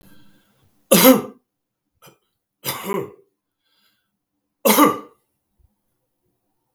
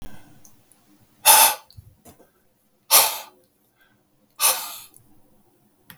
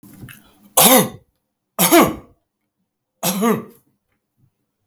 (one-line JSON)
{"three_cough_length": "6.7 s", "three_cough_amplitude": 32768, "three_cough_signal_mean_std_ratio": 0.27, "exhalation_length": "6.0 s", "exhalation_amplitude": 32768, "exhalation_signal_mean_std_ratio": 0.29, "cough_length": "4.9 s", "cough_amplitude": 32768, "cough_signal_mean_std_ratio": 0.36, "survey_phase": "beta (2021-08-13 to 2022-03-07)", "age": "45-64", "gender": "Male", "wearing_mask": "No", "symptom_none": true, "smoker_status": "Never smoked", "respiratory_condition_asthma": false, "respiratory_condition_other": false, "recruitment_source": "REACT", "submission_delay": "1 day", "covid_test_result": "Negative", "covid_test_method": "RT-qPCR"}